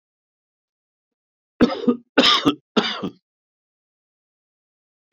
{"cough_length": "5.1 s", "cough_amplitude": 26515, "cough_signal_mean_std_ratio": 0.3, "survey_phase": "beta (2021-08-13 to 2022-03-07)", "age": "65+", "gender": "Male", "wearing_mask": "No", "symptom_shortness_of_breath": true, "symptom_fatigue": true, "smoker_status": "Ex-smoker", "respiratory_condition_asthma": false, "respiratory_condition_other": false, "recruitment_source": "Test and Trace", "submission_delay": "2 days", "covid_test_result": "Positive", "covid_test_method": "LFT"}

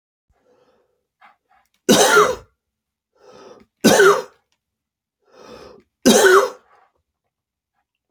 {"three_cough_length": "8.1 s", "three_cough_amplitude": 30918, "three_cough_signal_mean_std_ratio": 0.33, "survey_phase": "beta (2021-08-13 to 2022-03-07)", "age": "45-64", "gender": "Male", "wearing_mask": "No", "symptom_cough_any": true, "smoker_status": "Never smoked", "respiratory_condition_asthma": true, "respiratory_condition_other": false, "recruitment_source": "REACT", "submission_delay": "-1 day", "covid_test_result": "Negative", "covid_test_method": "RT-qPCR", "influenza_a_test_result": "Negative", "influenza_b_test_result": "Negative"}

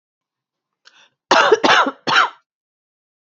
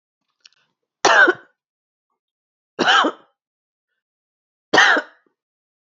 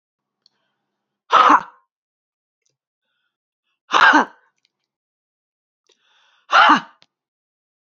{"cough_length": "3.2 s", "cough_amplitude": 30592, "cough_signal_mean_std_ratio": 0.39, "three_cough_length": "6.0 s", "three_cough_amplitude": 29837, "three_cough_signal_mean_std_ratio": 0.31, "exhalation_length": "7.9 s", "exhalation_amplitude": 30777, "exhalation_signal_mean_std_ratio": 0.27, "survey_phase": "beta (2021-08-13 to 2022-03-07)", "age": "45-64", "gender": "Female", "wearing_mask": "No", "symptom_cough_any": true, "symptom_runny_or_blocked_nose": true, "symptom_fatigue": true, "symptom_headache": true, "symptom_change_to_sense_of_smell_or_taste": true, "symptom_loss_of_taste": true, "symptom_onset": "5 days", "smoker_status": "Ex-smoker", "respiratory_condition_asthma": false, "respiratory_condition_other": false, "recruitment_source": "Test and Trace", "submission_delay": "2 days", "covid_test_result": "Positive", "covid_test_method": "LAMP"}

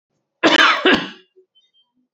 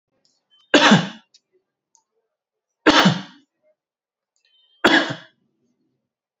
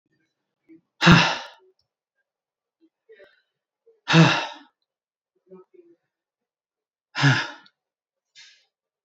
{"cough_length": "2.1 s", "cough_amplitude": 28936, "cough_signal_mean_std_ratio": 0.42, "three_cough_length": "6.4 s", "three_cough_amplitude": 32767, "three_cough_signal_mean_std_ratio": 0.29, "exhalation_length": "9.0 s", "exhalation_amplitude": 28855, "exhalation_signal_mean_std_ratio": 0.25, "survey_phase": "alpha (2021-03-01 to 2021-08-12)", "age": "45-64", "gender": "Male", "wearing_mask": "Yes", "symptom_diarrhoea": true, "smoker_status": "Never smoked", "respiratory_condition_asthma": false, "respiratory_condition_other": false, "recruitment_source": "Test and Trace", "submission_delay": "0 days", "covid_test_result": "Negative", "covid_test_method": "LFT"}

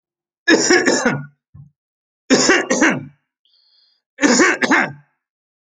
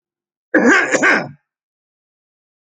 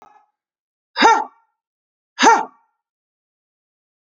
{"three_cough_length": "5.7 s", "three_cough_amplitude": 32767, "three_cough_signal_mean_std_ratio": 0.48, "cough_length": "2.7 s", "cough_amplitude": 31885, "cough_signal_mean_std_ratio": 0.4, "exhalation_length": "4.0 s", "exhalation_amplitude": 29717, "exhalation_signal_mean_std_ratio": 0.28, "survey_phase": "alpha (2021-03-01 to 2021-08-12)", "age": "45-64", "gender": "Male", "wearing_mask": "No", "symptom_none": true, "smoker_status": "Never smoked", "respiratory_condition_asthma": true, "respiratory_condition_other": false, "recruitment_source": "REACT", "submission_delay": "1 day", "covid_test_result": "Negative", "covid_test_method": "RT-qPCR"}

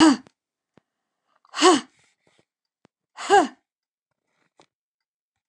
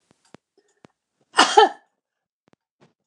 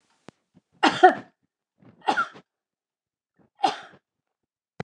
{"exhalation_length": "5.5 s", "exhalation_amplitude": 24780, "exhalation_signal_mean_std_ratio": 0.26, "cough_length": "3.1 s", "cough_amplitude": 29204, "cough_signal_mean_std_ratio": 0.22, "three_cough_length": "4.8 s", "three_cough_amplitude": 27458, "three_cough_signal_mean_std_ratio": 0.23, "survey_phase": "beta (2021-08-13 to 2022-03-07)", "age": "65+", "gender": "Female", "wearing_mask": "No", "symptom_runny_or_blocked_nose": true, "symptom_sore_throat": true, "smoker_status": "Never smoked", "respiratory_condition_asthma": false, "respiratory_condition_other": false, "recruitment_source": "REACT", "submission_delay": "2 days", "covid_test_result": "Negative", "covid_test_method": "RT-qPCR", "influenza_a_test_result": "Negative", "influenza_b_test_result": "Negative"}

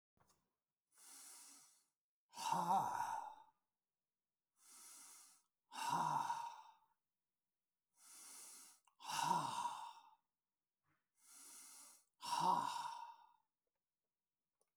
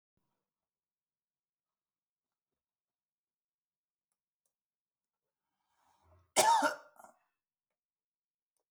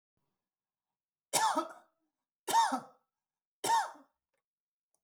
{"exhalation_length": "14.8 s", "exhalation_amplitude": 1571, "exhalation_signal_mean_std_ratio": 0.42, "cough_length": "8.7 s", "cough_amplitude": 5305, "cough_signal_mean_std_ratio": 0.17, "three_cough_length": "5.0 s", "three_cough_amplitude": 4537, "three_cough_signal_mean_std_ratio": 0.34, "survey_phase": "beta (2021-08-13 to 2022-03-07)", "age": "65+", "gender": "Male", "wearing_mask": "No", "symptom_none": true, "smoker_status": "Never smoked", "respiratory_condition_asthma": false, "respiratory_condition_other": false, "recruitment_source": "REACT", "submission_delay": "12 days", "covid_test_result": "Negative", "covid_test_method": "RT-qPCR"}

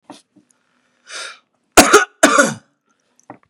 {"cough_length": "3.5 s", "cough_amplitude": 32768, "cough_signal_mean_std_ratio": 0.31, "survey_phase": "beta (2021-08-13 to 2022-03-07)", "age": "45-64", "gender": "Male", "wearing_mask": "No", "symptom_shortness_of_breath": true, "smoker_status": "Never smoked", "respiratory_condition_asthma": true, "respiratory_condition_other": false, "recruitment_source": "REACT", "submission_delay": "6 days", "covid_test_result": "Negative", "covid_test_method": "RT-qPCR", "influenza_a_test_result": "Negative", "influenza_b_test_result": "Negative"}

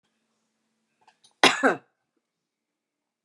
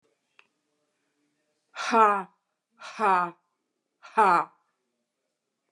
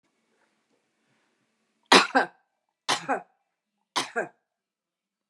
{"cough_length": "3.2 s", "cough_amplitude": 30178, "cough_signal_mean_std_ratio": 0.2, "exhalation_length": "5.7 s", "exhalation_amplitude": 15648, "exhalation_signal_mean_std_ratio": 0.31, "three_cough_length": "5.3 s", "three_cough_amplitude": 27853, "three_cough_signal_mean_std_ratio": 0.23, "survey_phase": "beta (2021-08-13 to 2022-03-07)", "age": "65+", "gender": "Female", "wearing_mask": "No", "symptom_none": true, "smoker_status": "Ex-smoker", "respiratory_condition_asthma": true, "respiratory_condition_other": false, "recruitment_source": "REACT", "submission_delay": "1 day", "covid_test_result": "Negative", "covid_test_method": "RT-qPCR", "influenza_a_test_result": "Negative", "influenza_b_test_result": "Negative"}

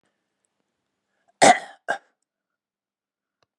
{"cough_length": "3.6 s", "cough_amplitude": 30939, "cough_signal_mean_std_ratio": 0.18, "survey_phase": "beta (2021-08-13 to 2022-03-07)", "age": "65+", "gender": "Male", "wearing_mask": "No", "symptom_cough_any": true, "symptom_runny_or_blocked_nose": true, "symptom_sore_throat": true, "symptom_onset": "4 days", "smoker_status": "Never smoked", "respiratory_condition_asthma": false, "respiratory_condition_other": false, "recruitment_source": "Test and Trace", "submission_delay": "1 day", "covid_test_result": "Positive", "covid_test_method": "RT-qPCR", "covid_ct_value": 23.0, "covid_ct_gene": "N gene"}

